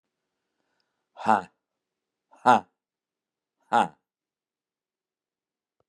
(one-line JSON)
{"exhalation_length": "5.9 s", "exhalation_amplitude": 21710, "exhalation_signal_mean_std_ratio": 0.19, "survey_phase": "beta (2021-08-13 to 2022-03-07)", "age": "65+", "gender": "Male", "wearing_mask": "No", "symptom_none": true, "smoker_status": "Never smoked", "respiratory_condition_asthma": false, "respiratory_condition_other": false, "recruitment_source": "REACT", "submission_delay": "2 days", "covid_test_result": "Negative", "covid_test_method": "RT-qPCR", "influenza_a_test_result": "Negative", "influenza_b_test_result": "Negative"}